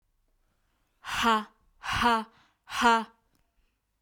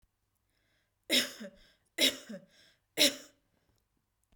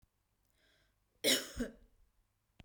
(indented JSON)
{
  "exhalation_length": "4.0 s",
  "exhalation_amplitude": 10525,
  "exhalation_signal_mean_std_ratio": 0.4,
  "three_cough_length": "4.4 s",
  "three_cough_amplitude": 10491,
  "three_cough_signal_mean_std_ratio": 0.28,
  "cough_length": "2.6 s",
  "cough_amplitude": 5937,
  "cough_signal_mean_std_ratio": 0.28,
  "survey_phase": "beta (2021-08-13 to 2022-03-07)",
  "age": "18-44",
  "gender": "Female",
  "wearing_mask": "No",
  "symptom_none": true,
  "smoker_status": "Never smoked",
  "respiratory_condition_asthma": false,
  "respiratory_condition_other": false,
  "recruitment_source": "REACT",
  "submission_delay": "1 day",
  "covid_test_result": "Negative",
  "covid_test_method": "RT-qPCR"
}